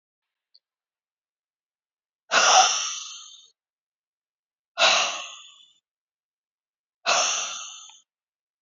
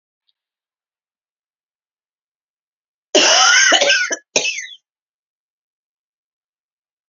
{"exhalation_length": "8.6 s", "exhalation_amplitude": 20338, "exhalation_signal_mean_std_ratio": 0.33, "cough_length": "7.1 s", "cough_amplitude": 31774, "cough_signal_mean_std_ratio": 0.33, "survey_phase": "beta (2021-08-13 to 2022-03-07)", "age": "45-64", "gender": "Female", "wearing_mask": "No", "symptom_cough_any": true, "symptom_new_continuous_cough": true, "symptom_runny_or_blocked_nose": true, "symptom_shortness_of_breath": true, "symptom_sore_throat": true, "symptom_fatigue": true, "symptom_headache": true, "symptom_onset": "3 days", "smoker_status": "Ex-smoker", "respiratory_condition_asthma": false, "respiratory_condition_other": false, "recruitment_source": "Test and Trace", "submission_delay": "1 day", "covid_test_result": "Negative", "covid_test_method": "RT-qPCR"}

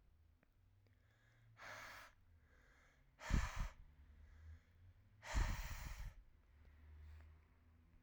{"exhalation_length": "8.0 s", "exhalation_amplitude": 1771, "exhalation_signal_mean_std_ratio": 0.41, "survey_phase": "alpha (2021-03-01 to 2021-08-12)", "age": "18-44", "gender": "Male", "wearing_mask": "No", "symptom_cough_any": true, "symptom_fatigue": true, "symptom_fever_high_temperature": true, "symptom_loss_of_taste": true, "symptom_onset": "4 days", "smoker_status": "Never smoked", "respiratory_condition_asthma": false, "respiratory_condition_other": false, "recruitment_source": "Test and Trace", "submission_delay": "1 day", "covid_test_result": "Positive", "covid_test_method": "RT-qPCR", "covid_ct_value": 17.6, "covid_ct_gene": "ORF1ab gene"}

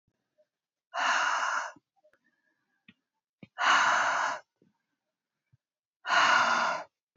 {"exhalation_length": "7.2 s", "exhalation_amplitude": 8572, "exhalation_signal_mean_std_ratio": 0.47, "survey_phase": "beta (2021-08-13 to 2022-03-07)", "age": "18-44", "gender": "Female", "wearing_mask": "No", "symptom_runny_or_blocked_nose": true, "symptom_sore_throat": true, "symptom_fatigue": true, "symptom_headache": true, "symptom_onset": "12 days", "smoker_status": "Never smoked", "respiratory_condition_asthma": false, "respiratory_condition_other": false, "recruitment_source": "REACT", "submission_delay": "2 days", "covid_test_result": "Negative", "covid_test_method": "RT-qPCR"}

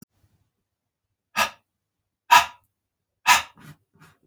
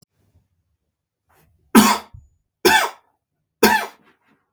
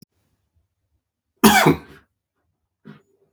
{"exhalation_length": "4.3 s", "exhalation_amplitude": 27395, "exhalation_signal_mean_std_ratio": 0.22, "three_cough_length": "4.5 s", "three_cough_amplitude": 32768, "three_cough_signal_mean_std_ratio": 0.3, "cough_length": "3.3 s", "cough_amplitude": 32768, "cough_signal_mean_std_ratio": 0.25, "survey_phase": "beta (2021-08-13 to 2022-03-07)", "age": "45-64", "gender": "Male", "wearing_mask": "No", "symptom_sore_throat": true, "smoker_status": "Never smoked", "respiratory_condition_asthma": false, "respiratory_condition_other": false, "recruitment_source": "Test and Trace", "submission_delay": "1 day", "covid_test_result": "Positive", "covid_test_method": "RT-qPCR", "covid_ct_value": 22.5, "covid_ct_gene": "S gene", "covid_ct_mean": 23.1, "covid_viral_load": "26000 copies/ml", "covid_viral_load_category": "Low viral load (10K-1M copies/ml)"}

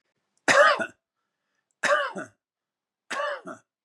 {"three_cough_length": "3.8 s", "three_cough_amplitude": 17707, "three_cough_signal_mean_std_ratio": 0.36, "survey_phase": "beta (2021-08-13 to 2022-03-07)", "age": "45-64", "gender": "Male", "wearing_mask": "No", "symptom_none": true, "smoker_status": "Ex-smoker", "respiratory_condition_asthma": false, "respiratory_condition_other": false, "recruitment_source": "REACT", "submission_delay": "5 days", "covid_test_result": "Negative", "covid_test_method": "RT-qPCR", "influenza_a_test_result": "Negative", "influenza_b_test_result": "Negative"}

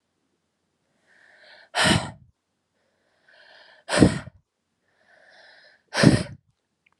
{"exhalation_length": "7.0 s", "exhalation_amplitude": 32281, "exhalation_signal_mean_std_ratio": 0.26, "survey_phase": "beta (2021-08-13 to 2022-03-07)", "age": "18-44", "gender": "Female", "wearing_mask": "No", "symptom_cough_any": true, "symptom_runny_or_blocked_nose": true, "symptom_shortness_of_breath": true, "symptom_fatigue": true, "symptom_headache": true, "symptom_onset": "5 days", "smoker_status": "Ex-smoker", "respiratory_condition_asthma": false, "respiratory_condition_other": false, "recruitment_source": "Test and Trace", "submission_delay": "2 days", "covid_test_result": "Positive", "covid_test_method": "RT-qPCR", "covid_ct_value": 26.6, "covid_ct_gene": "ORF1ab gene", "covid_ct_mean": 26.9, "covid_viral_load": "1500 copies/ml", "covid_viral_load_category": "Minimal viral load (< 10K copies/ml)"}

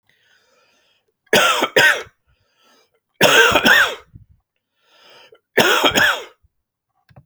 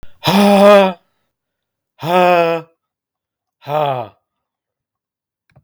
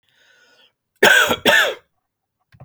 {"three_cough_length": "7.3 s", "three_cough_amplitude": 32768, "three_cough_signal_mean_std_ratio": 0.42, "exhalation_length": "5.6 s", "exhalation_amplitude": 32768, "exhalation_signal_mean_std_ratio": 0.41, "cough_length": "2.6 s", "cough_amplitude": 32768, "cough_signal_mean_std_ratio": 0.39, "survey_phase": "beta (2021-08-13 to 2022-03-07)", "age": "18-44", "gender": "Male", "wearing_mask": "No", "symptom_none": true, "smoker_status": "Never smoked", "respiratory_condition_asthma": false, "respiratory_condition_other": false, "recruitment_source": "REACT", "submission_delay": "13 days", "covid_test_result": "Negative", "covid_test_method": "RT-qPCR", "influenza_a_test_result": "Negative", "influenza_b_test_result": "Negative"}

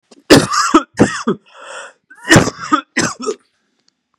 {"cough_length": "4.2 s", "cough_amplitude": 32768, "cough_signal_mean_std_ratio": 0.42, "survey_phase": "beta (2021-08-13 to 2022-03-07)", "age": "18-44", "gender": "Male", "wearing_mask": "No", "symptom_sore_throat": true, "symptom_headache": true, "smoker_status": "Ex-smoker", "respiratory_condition_asthma": false, "respiratory_condition_other": false, "recruitment_source": "Test and Trace", "submission_delay": "2 days", "covid_test_result": "Positive", "covid_test_method": "LFT"}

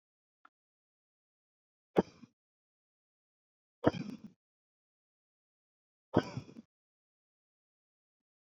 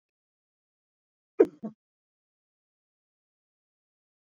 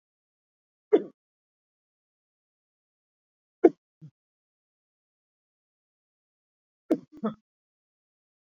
{"exhalation_length": "8.5 s", "exhalation_amplitude": 9342, "exhalation_signal_mean_std_ratio": 0.14, "cough_length": "4.4 s", "cough_amplitude": 15889, "cough_signal_mean_std_ratio": 0.1, "three_cough_length": "8.4 s", "three_cough_amplitude": 21787, "three_cough_signal_mean_std_ratio": 0.12, "survey_phase": "beta (2021-08-13 to 2022-03-07)", "age": "45-64", "gender": "Male", "wearing_mask": "No", "symptom_none": true, "smoker_status": "Never smoked", "respiratory_condition_asthma": true, "respiratory_condition_other": false, "recruitment_source": "REACT", "submission_delay": "2 days", "covid_test_result": "Negative", "covid_test_method": "RT-qPCR"}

